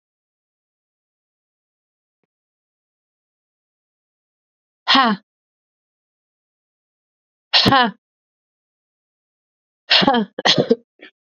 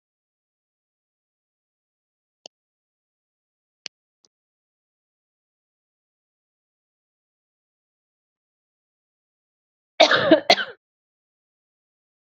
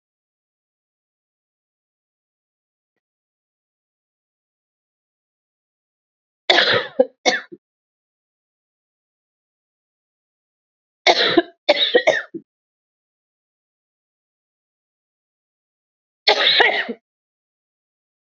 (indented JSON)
{
  "exhalation_length": "11.3 s",
  "exhalation_amplitude": 32767,
  "exhalation_signal_mean_std_ratio": 0.25,
  "cough_length": "12.3 s",
  "cough_amplitude": 31583,
  "cough_signal_mean_std_ratio": 0.14,
  "three_cough_length": "18.3 s",
  "three_cough_amplitude": 31814,
  "three_cough_signal_mean_std_ratio": 0.24,
  "survey_phase": "beta (2021-08-13 to 2022-03-07)",
  "age": "45-64",
  "gender": "Female",
  "wearing_mask": "No",
  "symptom_cough_any": true,
  "symptom_runny_or_blocked_nose": true,
  "symptom_sore_throat": true,
  "symptom_fever_high_temperature": true,
  "symptom_headache": true,
  "symptom_onset": "3 days",
  "smoker_status": "Ex-smoker",
  "respiratory_condition_asthma": false,
  "respiratory_condition_other": false,
  "recruitment_source": "Test and Trace",
  "submission_delay": "1 day",
  "covid_test_result": "Positive",
  "covid_test_method": "RT-qPCR",
  "covid_ct_value": 35.4,
  "covid_ct_gene": "N gene"
}